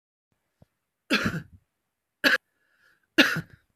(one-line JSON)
{"three_cough_length": "3.8 s", "three_cough_amplitude": 20972, "three_cough_signal_mean_std_ratio": 0.29, "survey_phase": "beta (2021-08-13 to 2022-03-07)", "age": "45-64", "gender": "Female", "wearing_mask": "No", "symptom_cough_any": true, "symptom_runny_or_blocked_nose": true, "symptom_onset": "4 days", "smoker_status": "Current smoker (11 or more cigarettes per day)", "respiratory_condition_asthma": false, "respiratory_condition_other": false, "recruitment_source": "REACT", "submission_delay": "1 day", "covid_test_result": "Negative", "covid_test_method": "RT-qPCR"}